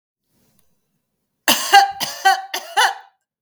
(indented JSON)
{
  "three_cough_length": "3.4 s",
  "three_cough_amplitude": 32768,
  "three_cough_signal_mean_std_ratio": 0.38,
  "survey_phase": "beta (2021-08-13 to 2022-03-07)",
  "age": "45-64",
  "gender": "Female",
  "wearing_mask": "No",
  "symptom_none": true,
  "symptom_onset": "12 days",
  "smoker_status": "Ex-smoker",
  "respiratory_condition_asthma": false,
  "respiratory_condition_other": false,
  "recruitment_source": "REACT",
  "submission_delay": "2 days",
  "covid_test_result": "Negative",
  "covid_test_method": "RT-qPCR",
  "influenza_a_test_result": "Unknown/Void",
  "influenza_b_test_result": "Unknown/Void"
}